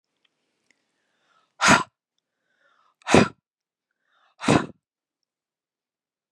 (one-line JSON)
{"exhalation_length": "6.3 s", "exhalation_amplitude": 32130, "exhalation_signal_mean_std_ratio": 0.22, "survey_phase": "beta (2021-08-13 to 2022-03-07)", "age": "45-64", "gender": "Female", "wearing_mask": "No", "symptom_cough_any": true, "symptom_runny_or_blocked_nose": true, "symptom_sore_throat": true, "symptom_headache": true, "symptom_onset": "11 days", "smoker_status": "Never smoked", "respiratory_condition_asthma": false, "respiratory_condition_other": false, "recruitment_source": "Test and Trace", "submission_delay": "2 days", "covid_test_result": "Positive", "covid_test_method": "RT-qPCR", "covid_ct_value": 20.6, "covid_ct_gene": "N gene"}